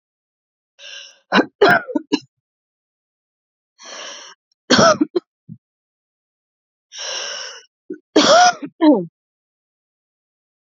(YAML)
three_cough_length: 10.8 s
three_cough_amplitude: 30825
three_cough_signal_mean_std_ratio: 0.32
survey_phase: beta (2021-08-13 to 2022-03-07)
age: 18-44
gender: Female
wearing_mask: 'No'
symptom_cough_any: true
smoker_status: Never smoked
respiratory_condition_asthma: false
respiratory_condition_other: false
recruitment_source: REACT
submission_delay: 2 days
covid_test_result: Negative
covid_test_method: RT-qPCR
influenza_a_test_result: Unknown/Void
influenza_b_test_result: Unknown/Void